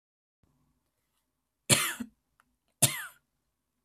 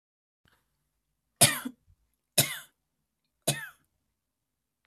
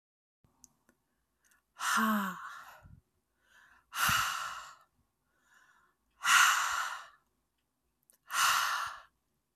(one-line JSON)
{"cough_length": "3.8 s", "cough_amplitude": 16893, "cough_signal_mean_std_ratio": 0.23, "three_cough_length": "4.9 s", "three_cough_amplitude": 19163, "three_cough_signal_mean_std_ratio": 0.21, "exhalation_length": "9.6 s", "exhalation_amplitude": 8278, "exhalation_signal_mean_std_ratio": 0.41, "survey_phase": "alpha (2021-03-01 to 2021-08-12)", "age": "18-44", "gender": "Female", "wearing_mask": "No", "symptom_none": true, "smoker_status": "Never smoked", "respiratory_condition_asthma": false, "respiratory_condition_other": false, "recruitment_source": "REACT", "submission_delay": "3 days", "covid_test_result": "Negative", "covid_test_method": "RT-qPCR"}